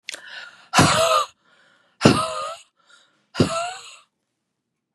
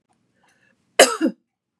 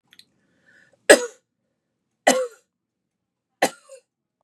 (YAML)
exhalation_length: 4.9 s
exhalation_amplitude: 32768
exhalation_signal_mean_std_ratio: 0.4
cough_length: 1.8 s
cough_amplitude: 32768
cough_signal_mean_std_ratio: 0.25
three_cough_length: 4.4 s
three_cough_amplitude: 32768
three_cough_signal_mean_std_ratio: 0.2
survey_phase: beta (2021-08-13 to 2022-03-07)
age: 45-64
gender: Female
wearing_mask: 'No'
symptom_none: true
smoker_status: Never smoked
respiratory_condition_asthma: false
respiratory_condition_other: false
recruitment_source: REACT
submission_delay: 1 day
covid_test_result: Negative
covid_test_method: RT-qPCR
influenza_a_test_result: Negative
influenza_b_test_result: Negative